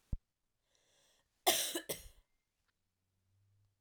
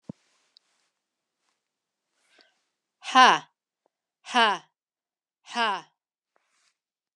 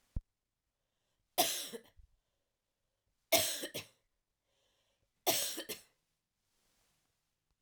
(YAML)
cough_length: 3.8 s
cough_amplitude: 5547
cough_signal_mean_std_ratio: 0.25
exhalation_length: 7.2 s
exhalation_amplitude: 27153
exhalation_signal_mean_std_ratio: 0.21
three_cough_length: 7.6 s
three_cough_amplitude: 6969
three_cough_signal_mean_std_ratio: 0.28
survey_phase: alpha (2021-03-01 to 2021-08-12)
age: 45-64
gender: Female
wearing_mask: 'No'
symptom_headache: true
symptom_loss_of_taste: true
smoker_status: Ex-smoker
respiratory_condition_asthma: false
respiratory_condition_other: false
recruitment_source: Test and Trace
submission_delay: 1 day
covid_test_result: Positive
covid_test_method: LFT